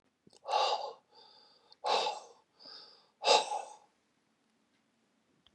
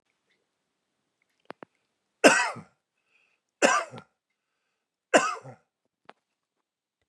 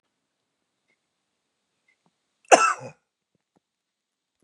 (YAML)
exhalation_length: 5.5 s
exhalation_amplitude: 8248
exhalation_signal_mean_std_ratio: 0.35
three_cough_length: 7.1 s
three_cough_amplitude: 25334
three_cough_signal_mean_std_ratio: 0.22
cough_length: 4.4 s
cough_amplitude: 32338
cough_signal_mean_std_ratio: 0.16
survey_phase: beta (2021-08-13 to 2022-03-07)
age: 65+
gender: Male
wearing_mask: 'No'
symptom_cough_any: true
symptom_onset: 2 days
smoker_status: Never smoked
respiratory_condition_asthma: false
respiratory_condition_other: false
recruitment_source: Test and Trace
submission_delay: 1 day
covid_test_result: Positive
covid_test_method: LAMP